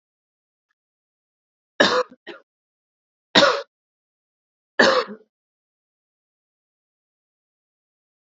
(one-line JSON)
{"three_cough_length": "8.4 s", "three_cough_amplitude": 30953, "three_cough_signal_mean_std_ratio": 0.23, "survey_phase": "alpha (2021-03-01 to 2021-08-12)", "age": "18-44", "gender": "Female", "wearing_mask": "No", "symptom_fatigue": true, "smoker_status": "Never smoked", "respiratory_condition_asthma": false, "respiratory_condition_other": false, "recruitment_source": "Test and Trace", "submission_delay": "1 day", "covid_test_result": "Positive", "covid_test_method": "LFT"}